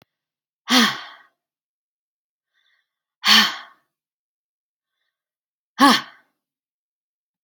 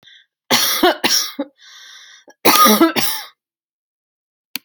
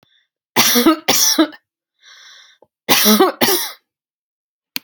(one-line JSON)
{"exhalation_length": "7.4 s", "exhalation_amplitude": 29271, "exhalation_signal_mean_std_ratio": 0.24, "three_cough_length": "4.6 s", "three_cough_amplitude": 32768, "three_cough_signal_mean_std_ratio": 0.45, "cough_length": "4.8 s", "cough_amplitude": 32768, "cough_signal_mean_std_ratio": 0.47, "survey_phase": "alpha (2021-03-01 to 2021-08-12)", "age": "45-64", "gender": "Female", "wearing_mask": "No", "symptom_none": true, "smoker_status": "Ex-smoker", "respiratory_condition_asthma": false, "respiratory_condition_other": false, "recruitment_source": "REACT", "submission_delay": "2 days", "covid_test_result": "Negative", "covid_test_method": "RT-qPCR"}